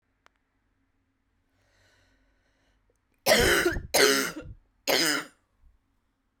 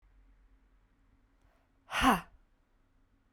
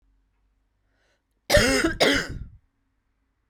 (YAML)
three_cough_length: 6.4 s
three_cough_amplitude: 16962
three_cough_signal_mean_std_ratio: 0.36
exhalation_length: 3.3 s
exhalation_amplitude: 6781
exhalation_signal_mean_std_ratio: 0.24
cough_length: 3.5 s
cough_amplitude: 22773
cough_signal_mean_std_ratio: 0.37
survey_phase: beta (2021-08-13 to 2022-03-07)
age: 18-44
gender: Female
wearing_mask: 'No'
symptom_cough_any: true
symptom_runny_or_blocked_nose: true
symptom_sore_throat: true
symptom_onset: 4 days
smoker_status: Ex-smoker
recruitment_source: REACT
submission_delay: 1 day
covid_test_result: Negative
covid_test_method: RT-qPCR